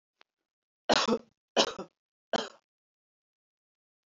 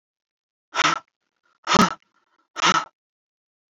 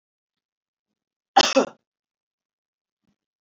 {
  "three_cough_length": "4.2 s",
  "three_cough_amplitude": 14030,
  "three_cough_signal_mean_std_ratio": 0.26,
  "exhalation_length": "3.8 s",
  "exhalation_amplitude": 27663,
  "exhalation_signal_mean_std_ratio": 0.31,
  "cough_length": "3.4 s",
  "cough_amplitude": 25638,
  "cough_signal_mean_std_ratio": 0.19,
  "survey_phase": "beta (2021-08-13 to 2022-03-07)",
  "age": "18-44",
  "gender": "Female",
  "wearing_mask": "No",
  "symptom_cough_any": true,
  "symptom_headache": true,
  "symptom_onset": "10 days",
  "smoker_status": "Never smoked",
  "respiratory_condition_asthma": false,
  "respiratory_condition_other": false,
  "recruitment_source": "REACT",
  "submission_delay": "2 days",
  "covid_test_result": "Negative",
  "covid_test_method": "RT-qPCR",
  "influenza_a_test_result": "Negative",
  "influenza_b_test_result": "Negative"
}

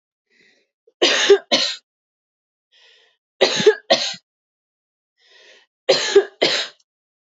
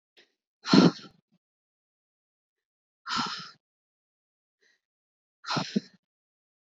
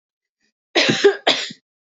{
  "three_cough_length": "7.3 s",
  "three_cough_amplitude": 27327,
  "three_cough_signal_mean_std_ratio": 0.35,
  "exhalation_length": "6.7 s",
  "exhalation_amplitude": 20691,
  "exhalation_signal_mean_std_ratio": 0.22,
  "cough_length": "2.0 s",
  "cough_amplitude": 26353,
  "cough_signal_mean_std_ratio": 0.41,
  "survey_phase": "beta (2021-08-13 to 2022-03-07)",
  "age": "18-44",
  "gender": "Female",
  "wearing_mask": "No",
  "symptom_sore_throat": true,
  "symptom_headache": true,
  "smoker_status": "Never smoked",
  "respiratory_condition_asthma": false,
  "respiratory_condition_other": false,
  "recruitment_source": "Test and Trace",
  "submission_delay": "1 day",
  "covid_test_result": "Positive",
  "covid_test_method": "RT-qPCR",
  "covid_ct_value": 35.3,
  "covid_ct_gene": "ORF1ab gene"
}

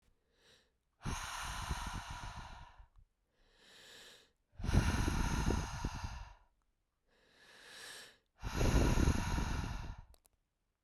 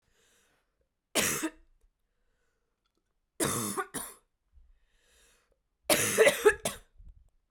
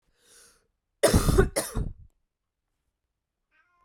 {
  "exhalation_length": "10.8 s",
  "exhalation_amplitude": 4805,
  "exhalation_signal_mean_std_ratio": 0.5,
  "three_cough_length": "7.5 s",
  "three_cough_amplitude": 14836,
  "three_cough_signal_mean_std_ratio": 0.32,
  "cough_length": "3.8 s",
  "cough_amplitude": 17695,
  "cough_signal_mean_std_ratio": 0.32,
  "survey_phase": "beta (2021-08-13 to 2022-03-07)",
  "age": "18-44",
  "gender": "Female",
  "wearing_mask": "No",
  "symptom_cough_any": true,
  "symptom_runny_or_blocked_nose": true,
  "symptom_sore_throat": true,
  "symptom_diarrhoea": true,
  "symptom_fatigue": true,
  "symptom_fever_high_temperature": true,
  "symptom_headache": true,
  "symptom_onset": "2 days",
  "smoker_status": "Never smoked",
  "respiratory_condition_asthma": false,
  "respiratory_condition_other": false,
  "recruitment_source": "Test and Trace",
  "submission_delay": "2 days",
  "covid_test_result": "Positive",
  "covid_test_method": "RT-qPCR",
  "covid_ct_value": 23.4,
  "covid_ct_gene": "ORF1ab gene"
}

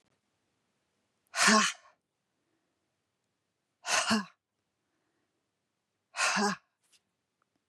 {
  "exhalation_length": "7.7 s",
  "exhalation_amplitude": 11557,
  "exhalation_signal_mean_std_ratio": 0.29,
  "survey_phase": "beta (2021-08-13 to 2022-03-07)",
  "age": "45-64",
  "gender": "Female",
  "wearing_mask": "No",
  "symptom_none": true,
  "smoker_status": "Never smoked",
  "respiratory_condition_asthma": false,
  "respiratory_condition_other": false,
  "recruitment_source": "REACT",
  "submission_delay": "1 day",
  "covid_test_result": "Negative",
  "covid_test_method": "RT-qPCR",
  "influenza_a_test_result": "Negative",
  "influenza_b_test_result": "Negative"
}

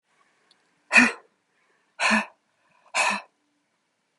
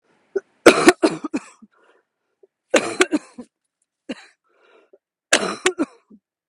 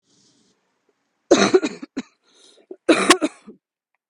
{
  "exhalation_length": "4.2 s",
  "exhalation_amplitude": 25045,
  "exhalation_signal_mean_std_ratio": 0.3,
  "three_cough_length": "6.5 s",
  "three_cough_amplitude": 32768,
  "three_cough_signal_mean_std_ratio": 0.28,
  "cough_length": "4.1 s",
  "cough_amplitude": 32768,
  "cough_signal_mean_std_ratio": 0.31,
  "survey_phase": "beta (2021-08-13 to 2022-03-07)",
  "age": "45-64",
  "gender": "Female",
  "wearing_mask": "No",
  "symptom_cough_any": true,
  "symptom_runny_or_blocked_nose": true,
  "symptom_shortness_of_breath": true,
  "symptom_fatigue": true,
  "symptom_onset": "12 days",
  "smoker_status": "Never smoked",
  "respiratory_condition_asthma": true,
  "respiratory_condition_other": false,
  "recruitment_source": "REACT",
  "submission_delay": "1 day",
  "covid_test_result": "Negative",
  "covid_test_method": "RT-qPCR",
  "influenza_a_test_result": "Negative",
  "influenza_b_test_result": "Negative"
}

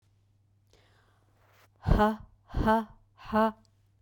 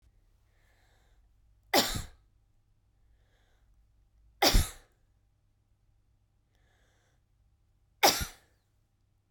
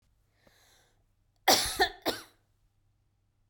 {
  "exhalation_length": "4.0 s",
  "exhalation_amplitude": 11381,
  "exhalation_signal_mean_std_ratio": 0.38,
  "three_cough_length": "9.3 s",
  "three_cough_amplitude": 11608,
  "three_cough_signal_mean_std_ratio": 0.22,
  "cough_length": "3.5 s",
  "cough_amplitude": 12098,
  "cough_signal_mean_std_ratio": 0.27,
  "survey_phase": "beta (2021-08-13 to 2022-03-07)",
  "age": "18-44",
  "gender": "Female",
  "wearing_mask": "No",
  "symptom_none": true,
  "symptom_onset": "5 days",
  "smoker_status": "Ex-smoker",
  "respiratory_condition_asthma": false,
  "respiratory_condition_other": false,
  "recruitment_source": "REACT",
  "submission_delay": "1 day",
  "covid_test_result": "Negative",
  "covid_test_method": "RT-qPCR",
  "influenza_a_test_result": "Negative",
  "influenza_b_test_result": "Negative"
}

